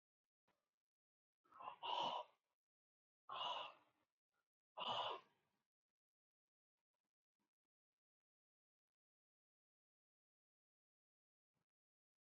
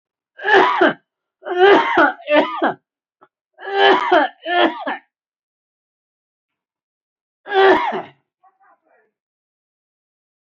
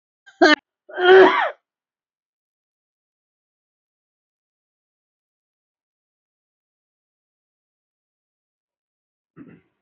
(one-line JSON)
{"exhalation_length": "12.2 s", "exhalation_amplitude": 727, "exhalation_signal_mean_std_ratio": 0.27, "three_cough_length": "10.4 s", "three_cough_amplitude": 29433, "three_cough_signal_mean_std_ratio": 0.42, "cough_length": "9.8 s", "cough_amplitude": 27398, "cough_signal_mean_std_ratio": 0.19, "survey_phase": "beta (2021-08-13 to 2022-03-07)", "age": "45-64", "gender": "Male", "wearing_mask": "No", "symptom_cough_any": true, "symptom_fatigue": true, "symptom_onset": "5 days", "smoker_status": "Never smoked", "respiratory_condition_asthma": false, "respiratory_condition_other": false, "recruitment_source": "Test and Trace", "submission_delay": "3 days", "covid_test_result": "Positive", "covid_test_method": "ePCR"}